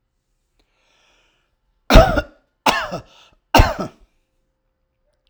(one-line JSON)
{"three_cough_length": "5.3 s", "three_cough_amplitude": 32768, "three_cough_signal_mean_std_ratio": 0.26, "survey_phase": "alpha (2021-03-01 to 2021-08-12)", "age": "45-64", "gender": "Male", "wearing_mask": "No", "symptom_none": true, "smoker_status": "Ex-smoker", "respiratory_condition_asthma": false, "respiratory_condition_other": false, "recruitment_source": "REACT", "submission_delay": "1 day", "covid_test_result": "Negative", "covid_test_method": "RT-qPCR"}